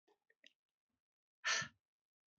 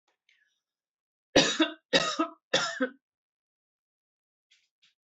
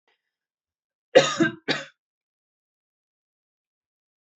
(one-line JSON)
{"exhalation_length": "2.4 s", "exhalation_amplitude": 1734, "exhalation_signal_mean_std_ratio": 0.24, "three_cough_length": "5.0 s", "three_cough_amplitude": 14965, "three_cough_signal_mean_std_ratio": 0.31, "cough_length": "4.4 s", "cough_amplitude": 26500, "cough_signal_mean_std_ratio": 0.21, "survey_phase": "beta (2021-08-13 to 2022-03-07)", "age": "18-44", "gender": "Female", "wearing_mask": "No", "symptom_cough_any": true, "symptom_new_continuous_cough": true, "symptom_runny_or_blocked_nose": true, "symptom_fatigue": true, "symptom_headache": true, "symptom_onset": "4 days", "smoker_status": "Ex-smoker", "respiratory_condition_asthma": false, "respiratory_condition_other": false, "recruitment_source": "Test and Trace", "submission_delay": "2 days", "covid_test_result": "Positive", "covid_test_method": "RT-qPCR", "covid_ct_value": 25.5, "covid_ct_gene": "ORF1ab gene", "covid_ct_mean": 26.1, "covid_viral_load": "2700 copies/ml", "covid_viral_load_category": "Minimal viral load (< 10K copies/ml)"}